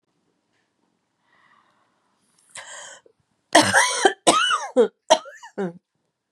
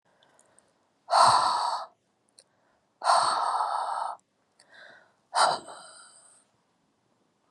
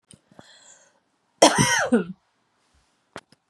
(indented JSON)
{
  "three_cough_length": "6.3 s",
  "three_cough_amplitude": 31952,
  "three_cough_signal_mean_std_ratio": 0.34,
  "exhalation_length": "7.5 s",
  "exhalation_amplitude": 16655,
  "exhalation_signal_mean_std_ratio": 0.41,
  "cough_length": "3.5 s",
  "cough_amplitude": 31337,
  "cough_signal_mean_std_ratio": 0.31,
  "survey_phase": "beta (2021-08-13 to 2022-03-07)",
  "age": "45-64",
  "gender": "Female",
  "wearing_mask": "No",
  "symptom_cough_any": true,
  "symptom_runny_or_blocked_nose": true,
  "symptom_shortness_of_breath": true,
  "symptom_abdominal_pain": true,
  "symptom_fatigue": true,
  "symptom_fever_high_temperature": true,
  "symptom_headache": true,
  "symptom_change_to_sense_of_smell_or_taste": true,
  "smoker_status": "Never smoked",
  "respiratory_condition_asthma": false,
  "respiratory_condition_other": false,
  "recruitment_source": "Test and Trace",
  "submission_delay": "2 days",
  "covid_test_method": "RT-qPCR",
  "covid_ct_value": 38.5,
  "covid_ct_gene": "ORF1ab gene"
}